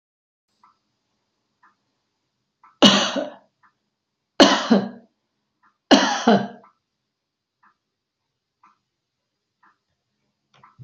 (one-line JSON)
{"three_cough_length": "10.8 s", "three_cough_amplitude": 29639, "three_cough_signal_mean_std_ratio": 0.25, "survey_phase": "beta (2021-08-13 to 2022-03-07)", "age": "65+", "gender": "Female", "wearing_mask": "No", "symptom_none": true, "smoker_status": "Never smoked", "respiratory_condition_asthma": false, "respiratory_condition_other": false, "recruitment_source": "REACT", "submission_delay": "1 day", "covid_test_result": "Negative", "covid_test_method": "RT-qPCR", "influenza_a_test_result": "Negative", "influenza_b_test_result": "Negative"}